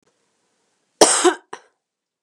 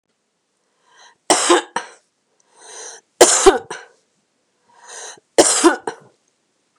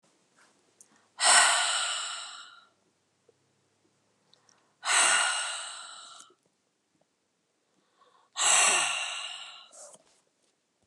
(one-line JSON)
{"cough_length": "2.2 s", "cough_amplitude": 32768, "cough_signal_mean_std_ratio": 0.28, "three_cough_length": "6.8 s", "three_cough_amplitude": 32768, "three_cough_signal_mean_std_ratio": 0.31, "exhalation_length": "10.9 s", "exhalation_amplitude": 15892, "exhalation_signal_mean_std_ratio": 0.39, "survey_phase": "beta (2021-08-13 to 2022-03-07)", "age": "45-64", "gender": "Female", "wearing_mask": "No", "symptom_none": true, "smoker_status": "Ex-smoker", "respiratory_condition_asthma": true, "respiratory_condition_other": false, "recruitment_source": "REACT", "submission_delay": "1 day", "covid_test_result": "Negative", "covid_test_method": "RT-qPCR", "influenza_a_test_result": "Negative", "influenza_b_test_result": "Negative"}